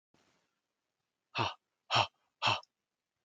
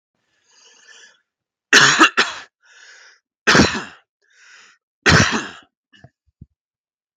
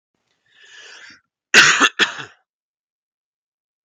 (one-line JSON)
{"exhalation_length": "3.2 s", "exhalation_amplitude": 6835, "exhalation_signal_mean_std_ratio": 0.29, "three_cough_length": "7.2 s", "three_cough_amplitude": 32768, "three_cough_signal_mean_std_ratio": 0.32, "cough_length": "3.8 s", "cough_amplitude": 32768, "cough_signal_mean_std_ratio": 0.27, "survey_phase": "beta (2021-08-13 to 2022-03-07)", "age": "18-44", "gender": "Male", "wearing_mask": "No", "symptom_other": true, "smoker_status": "Never smoked", "respiratory_condition_asthma": false, "respiratory_condition_other": false, "recruitment_source": "REACT", "submission_delay": "3 days", "covid_test_result": "Negative", "covid_test_method": "RT-qPCR", "influenza_a_test_result": "Negative", "influenza_b_test_result": "Negative"}